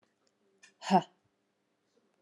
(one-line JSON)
{"exhalation_length": "2.2 s", "exhalation_amplitude": 9156, "exhalation_signal_mean_std_ratio": 0.19, "survey_phase": "beta (2021-08-13 to 2022-03-07)", "age": "45-64", "gender": "Female", "wearing_mask": "No", "symptom_cough_any": true, "smoker_status": "Never smoked", "respiratory_condition_asthma": false, "respiratory_condition_other": false, "recruitment_source": "REACT", "submission_delay": "1 day", "covid_test_result": "Negative", "covid_test_method": "RT-qPCR"}